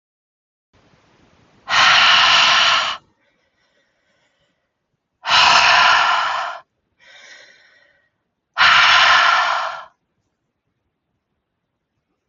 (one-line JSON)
{"exhalation_length": "12.3 s", "exhalation_amplitude": 31764, "exhalation_signal_mean_std_ratio": 0.46, "survey_phase": "alpha (2021-03-01 to 2021-08-12)", "age": "18-44", "gender": "Female", "wearing_mask": "No", "symptom_shortness_of_breath": true, "symptom_fatigue": true, "symptom_fever_high_temperature": true, "symptom_headache": true, "smoker_status": "Never smoked", "respiratory_condition_asthma": false, "respiratory_condition_other": false, "recruitment_source": "Test and Trace", "submission_delay": "2 days", "covid_test_result": "Positive", "covid_test_method": "RT-qPCR", "covid_ct_value": 25.4, "covid_ct_gene": "ORF1ab gene", "covid_ct_mean": 26.3, "covid_viral_load": "2400 copies/ml", "covid_viral_load_category": "Minimal viral load (< 10K copies/ml)"}